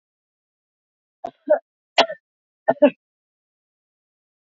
{
  "three_cough_length": "4.4 s",
  "three_cough_amplitude": 26841,
  "three_cough_signal_mean_std_ratio": 0.2,
  "survey_phase": "beta (2021-08-13 to 2022-03-07)",
  "age": "45-64",
  "gender": "Female",
  "wearing_mask": "No",
  "symptom_none": true,
  "smoker_status": "Ex-smoker",
  "respiratory_condition_asthma": false,
  "respiratory_condition_other": false,
  "recruitment_source": "REACT",
  "submission_delay": "1 day",
  "covid_test_result": "Negative",
  "covid_test_method": "RT-qPCR",
  "influenza_a_test_result": "Negative",
  "influenza_b_test_result": "Negative"
}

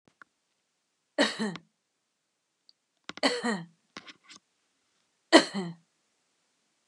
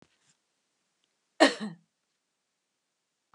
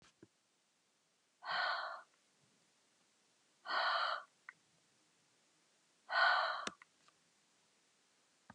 {
  "three_cough_length": "6.9 s",
  "three_cough_amplitude": 25164,
  "three_cough_signal_mean_std_ratio": 0.23,
  "cough_length": "3.3 s",
  "cough_amplitude": 18785,
  "cough_signal_mean_std_ratio": 0.16,
  "exhalation_length": "8.5 s",
  "exhalation_amplitude": 3561,
  "exhalation_signal_mean_std_ratio": 0.35,
  "survey_phase": "beta (2021-08-13 to 2022-03-07)",
  "age": "65+",
  "gender": "Female",
  "wearing_mask": "No",
  "symptom_none": true,
  "smoker_status": "Ex-smoker",
  "respiratory_condition_asthma": false,
  "respiratory_condition_other": false,
  "recruitment_source": "REACT",
  "submission_delay": "2 days",
  "covid_test_result": "Negative",
  "covid_test_method": "RT-qPCR"
}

